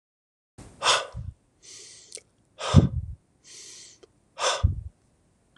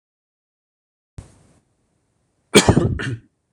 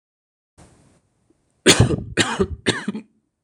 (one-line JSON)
{"exhalation_length": "5.6 s", "exhalation_amplitude": 25709, "exhalation_signal_mean_std_ratio": 0.32, "cough_length": "3.5 s", "cough_amplitude": 26028, "cough_signal_mean_std_ratio": 0.26, "three_cough_length": "3.4 s", "three_cough_amplitude": 26028, "three_cough_signal_mean_std_ratio": 0.36, "survey_phase": "beta (2021-08-13 to 2022-03-07)", "age": "45-64", "gender": "Male", "wearing_mask": "No", "symptom_none": true, "smoker_status": "Never smoked", "respiratory_condition_asthma": false, "respiratory_condition_other": false, "recruitment_source": "REACT", "submission_delay": "4 days", "covid_test_result": "Negative", "covid_test_method": "RT-qPCR"}